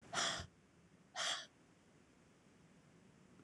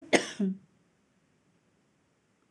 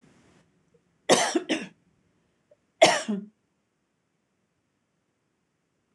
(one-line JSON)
{"exhalation_length": "3.4 s", "exhalation_amplitude": 1848, "exhalation_signal_mean_std_ratio": 0.41, "cough_length": "2.5 s", "cough_amplitude": 17153, "cough_signal_mean_std_ratio": 0.26, "three_cough_length": "5.9 s", "three_cough_amplitude": 21963, "three_cough_signal_mean_std_ratio": 0.25, "survey_phase": "beta (2021-08-13 to 2022-03-07)", "age": "65+", "gender": "Female", "wearing_mask": "No", "symptom_none": true, "smoker_status": "Ex-smoker", "respiratory_condition_asthma": false, "respiratory_condition_other": false, "recruitment_source": "REACT", "submission_delay": "3 days", "covid_test_result": "Negative", "covid_test_method": "RT-qPCR", "influenza_a_test_result": "Negative", "influenza_b_test_result": "Negative"}